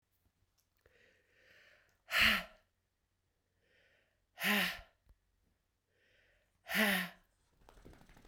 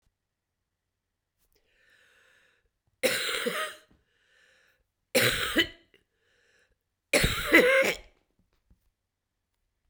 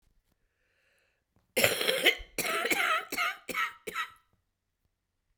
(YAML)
exhalation_length: 8.3 s
exhalation_amplitude: 5193
exhalation_signal_mean_std_ratio: 0.29
three_cough_length: 9.9 s
three_cough_amplitude: 17848
three_cough_signal_mean_std_ratio: 0.32
cough_length: 5.4 s
cough_amplitude: 16619
cough_signal_mean_std_ratio: 0.45
survey_phase: beta (2021-08-13 to 2022-03-07)
age: 45-64
gender: Female
wearing_mask: 'No'
symptom_cough_any: true
symptom_runny_or_blocked_nose: true
symptom_fatigue: true
symptom_change_to_sense_of_smell_or_taste: true
symptom_loss_of_taste: true
symptom_onset: 4 days
smoker_status: Never smoked
respiratory_condition_asthma: false
respiratory_condition_other: false
recruitment_source: Test and Trace
submission_delay: 2 days
covid_test_result: Positive
covid_test_method: RT-qPCR
covid_ct_value: 19.8
covid_ct_gene: ORF1ab gene
covid_ct_mean: 20.3
covid_viral_load: 230000 copies/ml
covid_viral_load_category: Low viral load (10K-1M copies/ml)